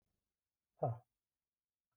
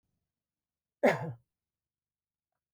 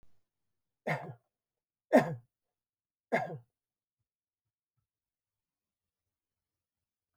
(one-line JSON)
{"exhalation_length": "2.0 s", "exhalation_amplitude": 1971, "exhalation_signal_mean_std_ratio": 0.21, "cough_length": "2.7 s", "cough_amplitude": 8653, "cough_signal_mean_std_ratio": 0.21, "three_cough_length": "7.2 s", "three_cough_amplitude": 9295, "three_cough_signal_mean_std_ratio": 0.18, "survey_phase": "beta (2021-08-13 to 2022-03-07)", "age": "65+", "gender": "Male", "wearing_mask": "No", "symptom_runny_or_blocked_nose": true, "symptom_onset": "12 days", "smoker_status": "Never smoked", "respiratory_condition_asthma": false, "respiratory_condition_other": true, "recruitment_source": "REACT", "submission_delay": "1 day", "covid_test_result": "Negative", "covid_test_method": "RT-qPCR"}